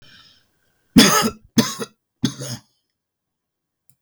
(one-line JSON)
{"three_cough_length": "4.0 s", "three_cough_amplitude": 32768, "three_cough_signal_mean_std_ratio": 0.3, "survey_phase": "beta (2021-08-13 to 2022-03-07)", "age": "65+", "gender": "Male", "wearing_mask": "No", "symptom_none": true, "smoker_status": "Ex-smoker", "respiratory_condition_asthma": false, "respiratory_condition_other": false, "recruitment_source": "REACT", "submission_delay": "3 days", "covid_test_result": "Negative", "covid_test_method": "RT-qPCR", "influenza_a_test_result": "Negative", "influenza_b_test_result": "Negative"}